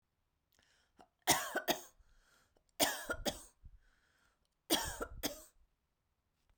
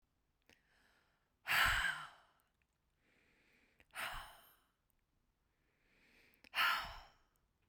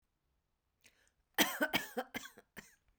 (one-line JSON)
{"three_cough_length": "6.6 s", "three_cough_amplitude": 5848, "three_cough_signal_mean_std_ratio": 0.33, "exhalation_length": "7.7 s", "exhalation_amplitude": 3507, "exhalation_signal_mean_std_ratio": 0.31, "cough_length": "3.0 s", "cough_amplitude": 7319, "cough_signal_mean_std_ratio": 0.3, "survey_phase": "beta (2021-08-13 to 2022-03-07)", "age": "18-44", "gender": "Female", "wearing_mask": "No", "symptom_none": true, "smoker_status": "Never smoked", "respiratory_condition_asthma": false, "respiratory_condition_other": false, "recruitment_source": "REACT", "submission_delay": "0 days", "covid_test_result": "Negative", "covid_test_method": "RT-qPCR"}